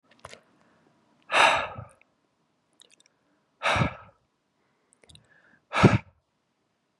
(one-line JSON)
{"exhalation_length": "7.0 s", "exhalation_amplitude": 21781, "exhalation_signal_mean_std_ratio": 0.27, "survey_phase": "beta (2021-08-13 to 2022-03-07)", "age": "18-44", "gender": "Male", "wearing_mask": "No", "symptom_none": true, "smoker_status": "Never smoked", "respiratory_condition_asthma": false, "respiratory_condition_other": false, "recruitment_source": "Test and Trace", "submission_delay": "1 day", "covid_test_result": "Positive", "covid_test_method": "RT-qPCR", "covid_ct_value": 23.2, "covid_ct_gene": "ORF1ab gene", "covid_ct_mean": 23.5, "covid_viral_load": "20000 copies/ml", "covid_viral_load_category": "Low viral load (10K-1M copies/ml)"}